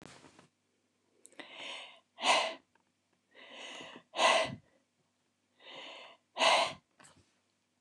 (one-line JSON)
{"exhalation_length": "7.8 s", "exhalation_amplitude": 7270, "exhalation_signal_mean_std_ratio": 0.33, "survey_phase": "beta (2021-08-13 to 2022-03-07)", "age": "65+", "gender": "Female", "wearing_mask": "No", "symptom_none": true, "smoker_status": "Ex-smoker", "respiratory_condition_asthma": false, "respiratory_condition_other": false, "recruitment_source": "REACT", "submission_delay": "1 day", "covid_test_result": "Negative", "covid_test_method": "RT-qPCR"}